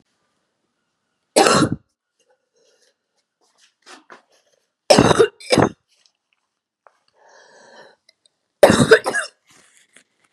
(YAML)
three_cough_length: 10.3 s
three_cough_amplitude: 32768
three_cough_signal_mean_std_ratio: 0.27
survey_phase: beta (2021-08-13 to 2022-03-07)
age: 45-64
gender: Female
wearing_mask: 'No'
symptom_cough_any: true
symptom_runny_or_blocked_nose: true
symptom_shortness_of_breath: true
symptom_abdominal_pain: true
symptom_diarrhoea: true
symptom_fatigue: true
symptom_headache: true
smoker_status: Never smoked
respiratory_condition_asthma: false
respiratory_condition_other: false
recruitment_source: Test and Trace
submission_delay: 2 days
covid_test_result: Positive
covid_test_method: RT-qPCR
covid_ct_value: 22.3
covid_ct_gene: ORF1ab gene